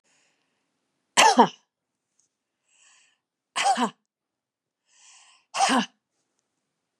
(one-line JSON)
{"exhalation_length": "7.0 s", "exhalation_amplitude": 26613, "exhalation_signal_mean_std_ratio": 0.27, "survey_phase": "beta (2021-08-13 to 2022-03-07)", "age": "45-64", "gender": "Female", "wearing_mask": "No", "symptom_none": true, "symptom_onset": "13 days", "smoker_status": "Never smoked", "respiratory_condition_asthma": true, "respiratory_condition_other": false, "recruitment_source": "REACT", "submission_delay": "2 days", "covid_test_result": "Negative", "covid_test_method": "RT-qPCR", "influenza_a_test_result": "Negative", "influenza_b_test_result": "Negative"}